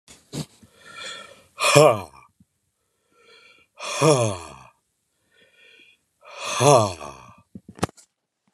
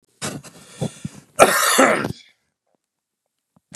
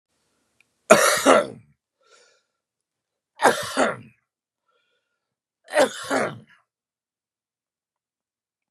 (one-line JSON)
{"exhalation_length": "8.5 s", "exhalation_amplitude": 32767, "exhalation_signal_mean_std_ratio": 0.31, "cough_length": "3.8 s", "cough_amplitude": 32768, "cough_signal_mean_std_ratio": 0.36, "three_cough_length": "8.7 s", "three_cough_amplitude": 32768, "three_cough_signal_mean_std_ratio": 0.28, "survey_phase": "beta (2021-08-13 to 2022-03-07)", "age": "45-64", "gender": "Male", "wearing_mask": "No", "symptom_cough_any": true, "symptom_shortness_of_breath": true, "symptom_sore_throat": true, "symptom_fatigue": true, "symptom_onset": "5 days", "smoker_status": "Never smoked", "respiratory_condition_asthma": false, "respiratory_condition_other": false, "recruitment_source": "REACT", "submission_delay": "1 day", "covid_test_result": "Positive", "covid_test_method": "RT-qPCR", "covid_ct_value": 19.4, "covid_ct_gene": "E gene", "influenza_a_test_result": "Negative", "influenza_b_test_result": "Negative"}